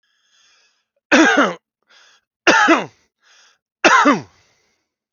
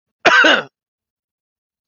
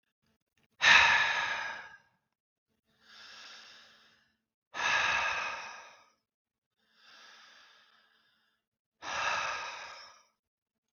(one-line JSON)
{"three_cough_length": "5.1 s", "three_cough_amplitude": 29349, "three_cough_signal_mean_std_ratio": 0.39, "cough_length": "1.9 s", "cough_amplitude": 31239, "cough_signal_mean_std_ratio": 0.37, "exhalation_length": "10.9 s", "exhalation_amplitude": 12514, "exhalation_signal_mean_std_ratio": 0.35, "survey_phase": "beta (2021-08-13 to 2022-03-07)", "age": "45-64", "gender": "Male", "wearing_mask": "No", "symptom_none": true, "smoker_status": "Never smoked", "respiratory_condition_asthma": false, "respiratory_condition_other": false, "recruitment_source": "REACT", "submission_delay": "4 days", "covid_test_result": "Negative", "covid_test_method": "RT-qPCR"}